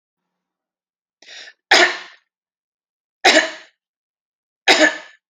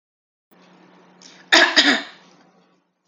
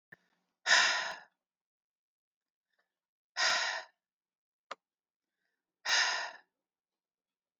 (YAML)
three_cough_length: 5.3 s
three_cough_amplitude: 31202
three_cough_signal_mean_std_ratio: 0.3
cough_length: 3.1 s
cough_amplitude: 31398
cough_signal_mean_std_ratio: 0.31
exhalation_length: 7.6 s
exhalation_amplitude: 7636
exhalation_signal_mean_std_ratio: 0.32
survey_phase: alpha (2021-03-01 to 2021-08-12)
age: 45-64
gender: Female
wearing_mask: 'No'
symptom_none: true
smoker_status: Never smoked
respiratory_condition_asthma: false
respiratory_condition_other: false
recruitment_source: REACT
submission_delay: 1 day
covid_test_result: Negative
covid_test_method: RT-qPCR